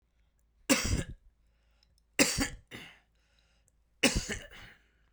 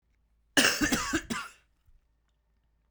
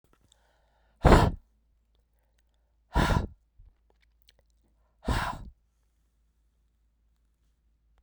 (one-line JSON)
{"three_cough_length": "5.1 s", "three_cough_amplitude": 10871, "three_cough_signal_mean_std_ratio": 0.34, "cough_length": "2.9 s", "cough_amplitude": 11607, "cough_signal_mean_std_ratio": 0.38, "exhalation_length": "8.0 s", "exhalation_amplitude": 18757, "exhalation_signal_mean_std_ratio": 0.24, "survey_phase": "beta (2021-08-13 to 2022-03-07)", "age": "45-64", "gender": "Male", "wearing_mask": "No", "symptom_runny_or_blocked_nose": true, "symptom_change_to_sense_of_smell_or_taste": true, "symptom_loss_of_taste": true, "symptom_onset": "5 days", "smoker_status": "Never smoked", "respiratory_condition_asthma": false, "respiratory_condition_other": false, "recruitment_source": "Test and Trace", "submission_delay": "2 days", "covid_test_result": "Positive", "covid_test_method": "RT-qPCR", "covid_ct_value": 14.9, "covid_ct_gene": "ORF1ab gene", "covid_ct_mean": 15.2, "covid_viral_load": "10000000 copies/ml", "covid_viral_load_category": "High viral load (>1M copies/ml)"}